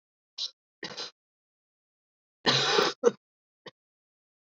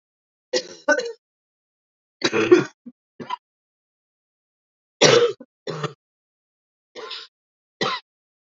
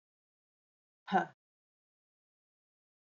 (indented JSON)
{
  "cough_length": "4.4 s",
  "cough_amplitude": 11772,
  "cough_signal_mean_std_ratio": 0.3,
  "three_cough_length": "8.5 s",
  "three_cough_amplitude": 28903,
  "three_cough_signal_mean_std_ratio": 0.29,
  "exhalation_length": "3.2 s",
  "exhalation_amplitude": 4591,
  "exhalation_signal_mean_std_ratio": 0.16,
  "survey_phase": "beta (2021-08-13 to 2022-03-07)",
  "age": "45-64",
  "gender": "Female",
  "wearing_mask": "No",
  "symptom_cough_any": true,
  "symptom_runny_or_blocked_nose": true,
  "symptom_shortness_of_breath": true,
  "symptom_fatigue": true,
  "symptom_fever_high_temperature": true,
  "symptom_headache": true,
  "symptom_onset": "4 days",
  "smoker_status": "Current smoker (1 to 10 cigarettes per day)",
  "respiratory_condition_asthma": false,
  "respiratory_condition_other": false,
  "recruitment_source": "Test and Trace",
  "submission_delay": "1 day",
  "covid_test_result": "Positive",
  "covid_test_method": "RT-qPCR",
  "covid_ct_value": 18.0,
  "covid_ct_gene": "ORF1ab gene"
}